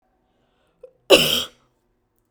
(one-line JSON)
{"cough_length": "2.3 s", "cough_amplitude": 32768, "cough_signal_mean_std_ratio": 0.26, "survey_phase": "beta (2021-08-13 to 2022-03-07)", "age": "18-44", "gender": "Female", "wearing_mask": "No", "symptom_none": true, "smoker_status": "Never smoked", "respiratory_condition_asthma": false, "respiratory_condition_other": false, "recruitment_source": "REACT", "submission_delay": "1 day", "covid_test_result": "Negative", "covid_test_method": "RT-qPCR"}